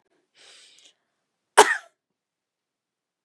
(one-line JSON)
{"cough_length": "3.2 s", "cough_amplitude": 32767, "cough_signal_mean_std_ratio": 0.15, "survey_phase": "beta (2021-08-13 to 2022-03-07)", "age": "45-64", "gender": "Female", "wearing_mask": "No", "symptom_runny_or_blocked_nose": true, "symptom_fatigue": true, "symptom_headache": true, "symptom_change_to_sense_of_smell_or_taste": true, "smoker_status": "Never smoked", "respiratory_condition_asthma": true, "respiratory_condition_other": false, "recruitment_source": "Test and Trace", "submission_delay": "2 days", "covid_test_result": "Positive", "covid_test_method": "ePCR"}